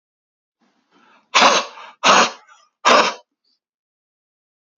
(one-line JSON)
{"exhalation_length": "4.8 s", "exhalation_amplitude": 32768, "exhalation_signal_mean_std_ratio": 0.34, "survey_phase": "beta (2021-08-13 to 2022-03-07)", "age": "18-44", "gender": "Male", "wearing_mask": "No", "symptom_none": true, "smoker_status": "Current smoker (11 or more cigarettes per day)", "respiratory_condition_asthma": false, "respiratory_condition_other": false, "recruitment_source": "REACT", "submission_delay": "1 day", "covid_test_result": "Negative", "covid_test_method": "RT-qPCR", "influenza_a_test_result": "Negative", "influenza_b_test_result": "Negative"}